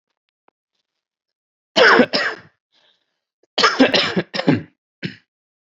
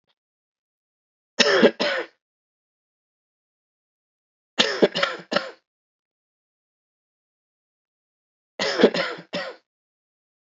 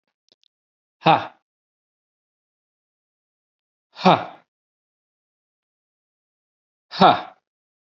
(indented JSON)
{
  "cough_length": "5.7 s",
  "cough_amplitude": 31128,
  "cough_signal_mean_std_ratio": 0.36,
  "three_cough_length": "10.4 s",
  "three_cough_amplitude": 28828,
  "three_cough_signal_mean_std_ratio": 0.28,
  "exhalation_length": "7.9 s",
  "exhalation_amplitude": 32768,
  "exhalation_signal_mean_std_ratio": 0.19,
  "survey_phase": "beta (2021-08-13 to 2022-03-07)",
  "age": "18-44",
  "gender": "Male",
  "wearing_mask": "No",
  "symptom_sore_throat": true,
  "symptom_headache": true,
  "smoker_status": "Never smoked",
  "respiratory_condition_asthma": false,
  "respiratory_condition_other": false,
  "recruitment_source": "Test and Trace",
  "submission_delay": "-1 day",
  "covid_test_result": "Positive",
  "covid_test_method": "LFT"
}